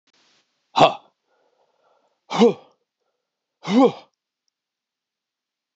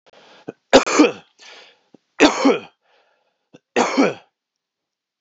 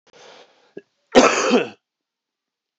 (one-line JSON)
{"exhalation_length": "5.8 s", "exhalation_amplitude": 27583, "exhalation_signal_mean_std_ratio": 0.25, "three_cough_length": "5.2 s", "three_cough_amplitude": 29412, "three_cough_signal_mean_std_ratio": 0.33, "cough_length": "2.8 s", "cough_amplitude": 27993, "cough_signal_mean_std_ratio": 0.32, "survey_phase": "alpha (2021-03-01 to 2021-08-12)", "age": "45-64", "gender": "Male", "wearing_mask": "No", "symptom_cough_any": true, "symptom_fatigue": true, "symptom_headache": true, "symptom_change_to_sense_of_smell_or_taste": true, "symptom_loss_of_taste": true, "smoker_status": "Never smoked", "respiratory_condition_asthma": false, "respiratory_condition_other": false, "recruitment_source": "Test and Trace", "submission_delay": "2 days", "covid_test_result": "Positive", "covid_test_method": "RT-qPCR", "covid_ct_value": 17.5, "covid_ct_gene": "ORF1ab gene", "covid_ct_mean": 18.6, "covid_viral_load": "820000 copies/ml", "covid_viral_load_category": "Low viral load (10K-1M copies/ml)"}